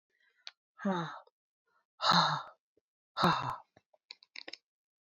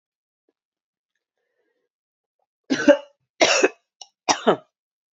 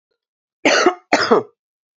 {"exhalation_length": "5.0 s", "exhalation_amplitude": 6622, "exhalation_signal_mean_std_ratio": 0.35, "three_cough_length": "5.1 s", "three_cough_amplitude": 28991, "three_cough_signal_mean_std_ratio": 0.26, "cough_length": "2.0 s", "cough_amplitude": 30187, "cough_signal_mean_std_ratio": 0.43, "survey_phase": "beta (2021-08-13 to 2022-03-07)", "age": "45-64", "gender": "Female", "wearing_mask": "No", "symptom_cough_any": true, "symptom_runny_or_blocked_nose": true, "symptom_sore_throat": true, "symptom_fatigue": true, "symptom_fever_high_temperature": true, "symptom_headache": true, "symptom_change_to_sense_of_smell_or_taste": true, "symptom_other": true, "smoker_status": "Never smoked", "respiratory_condition_asthma": false, "respiratory_condition_other": false, "recruitment_source": "Test and Trace", "submission_delay": "2 days", "covid_test_result": "Positive", "covid_test_method": "RT-qPCR", "covid_ct_value": 32.0, "covid_ct_gene": "ORF1ab gene", "covid_ct_mean": 33.9, "covid_viral_load": "7.7 copies/ml", "covid_viral_load_category": "Minimal viral load (< 10K copies/ml)"}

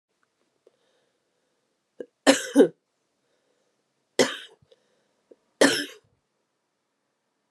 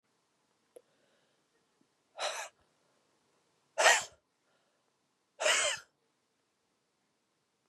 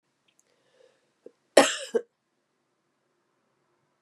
{"three_cough_length": "7.5 s", "three_cough_amplitude": 24612, "three_cough_signal_mean_std_ratio": 0.21, "exhalation_length": "7.7 s", "exhalation_amplitude": 13044, "exhalation_signal_mean_std_ratio": 0.24, "cough_length": "4.0 s", "cough_amplitude": 32134, "cough_signal_mean_std_ratio": 0.17, "survey_phase": "beta (2021-08-13 to 2022-03-07)", "age": "45-64", "gender": "Female", "wearing_mask": "No", "symptom_cough_any": true, "symptom_runny_or_blocked_nose": true, "symptom_shortness_of_breath": true, "symptom_sore_throat": true, "symptom_fatigue": true, "symptom_headache": true, "symptom_onset": "3 days", "smoker_status": "Never smoked", "respiratory_condition_asthma": true, "respiratory_condition_other": false, "recruitment_source": "Test and Trace", "submission_delay": "2 days", "covid_test_result": "Positive", "covid_test_method": "RT-qPCR", "covid_ct_value": 19.3, "covid_ct_gene": "N gene"}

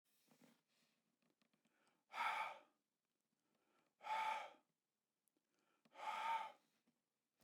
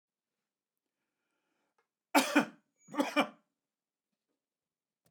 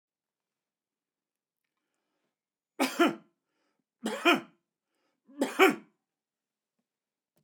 {"exhalation_length": "7.4 s", "exhalation_amplitude": 849, "exhalation_signal_mean_std_ratio": 0.36, "cough_length": "5.1 s", "cough_amplitude": 9970, "cough_signal_mean_std_ratio": 0.22, "three_cough_length": "7.4 s", "three_cough_amplitude": 16324, "three_cough_signal_mean_std_ratio": 0.23, "survey_phase": "beta (2021-08-13 to 2022-03-07)", "age": "65+", "gender": "Male", "wearing_mask": "No", "symptom_headache": true, "symptom_onset": "7 days", "smoker_status": "Never smoked", "respiratory_condition_asthma": false, "respiratory_condition_other": false, "recruitment_source": "REACT", "submission_delay": "1 day", "covid_test_result": "Negative", "covid_test_method": "RT-qPCR", "influenza_a_test_result": "Negative", "influenza_b_test_result": "Negative"}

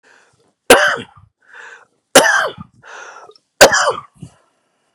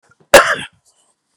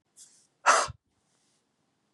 {"three_cough_length": "4.9 s", "three_cough_amplitude": 32768, "three_cough_signal_mean_std_ratio": 0.34, "cough_length": "1.4 s", "cough_amplitude": 32768, "cough_signal_mean_std_ratio": 0.3, "exhalation_length": "2.1 s", "exhalation_amplitude": 14475, "exhalation_signal_mean_std_ratio": 0.25, "survey_phase": "beta (2021-08-13 to 2022-03-07)", "age": "45-64", "gender": "Male", "wearing_mask": "No", "symptom_cough_any": true, "symptom_shortness_of_breath": true, "symptom_fatigue": true, "symptom_onset": "12 days", "smoker_status": "Never smoked", "respiratory_condition_asthma": true, "respiratory_condition_other": false, "recruitment_source": "REACT", "submission_delay": "3 days", "covid_test_result": "Negative", "covid_test_method": "RT-qPCR", "influenza_a_test_result": "Positive", "influenza_a_ct_value": 28.8, "influenza_b_test_result": "Negative"}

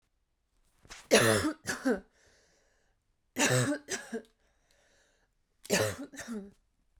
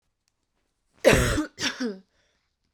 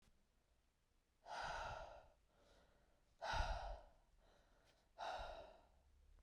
{"three_cough_length": "7.0 s", "three_cough_amplitude": 11265, "three_cough_signal_mean_std_ratio": 0.38, "cough_length": "2.7 s", "cough_amplitude": 23619, "cough_signal_mean_std_ratio": 0.36, "exhalation_length": "6.2 s", "exhalation_amplitude": 1076, "exhalation_signal_mean_std_ratio": 0.47, "survey_phase": "beta (2021-08-13 to 2022-03-07)", "age": "18-44", "gender": "Female", "wearing_mask": "No", "symptom_cough_any": true, "symptom_new_continuous_cough": true, "symptom_runny_or_blocked_nose": true, "symptom_sore_throat": true, "symptom_headache": true, "smoker_status": "Never smoked", "respiratory_condition_asthma": false, "respiratory_condition_other": false, "recruitment_source": "Test and Trace", "submission_delay": "2 days", "covid_test_result": "Positive", "covid_test_method": "RT-qPCR", "covid_ct_value": 22.0, "covid_ct_gene": "N gene", "covid_ct_mean": 22.8, "covid_viral_load": "33000 copies/ml", "covid_viral_load_category": "Low viral load (10K-1M copies/ml)"}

